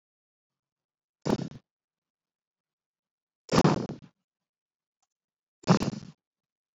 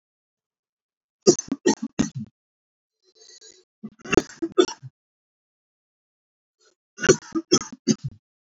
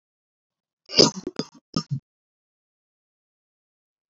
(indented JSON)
{
  "exhalation_length": "6.7 s",
  "exhalation_amplitude": 13099,
  "exhalation_signal_mean_std_ratio": 0.24,
  "cough_length": "8.4 s",
  "cough_amplitude": 30009,
  "cough_signal_mean_std_ratio": 0.24,
  "three_cough_length": "4.1 s",
  "three_cough_amplitude": 32318,
  "three_cough_signal_mean_std_ratio": 0.19,
  "survey_phase": "alpha (2021-03-01 to 2021-08-12)",
  "age": "18-44",
  "gender": "Male",
  "wearing_mask": "No",
  "symptom_none": true,
  "smoker_status": "Ex-smoker",
  "respiratory_condition_asthma": true,
  "respiratory_condition_other": false,
  "recruitment_source": "REACT",
  "submission_delay": "1 day",
  "covid_test_result": "Negative",
  "covid_test_method": "RT-qPCR"
}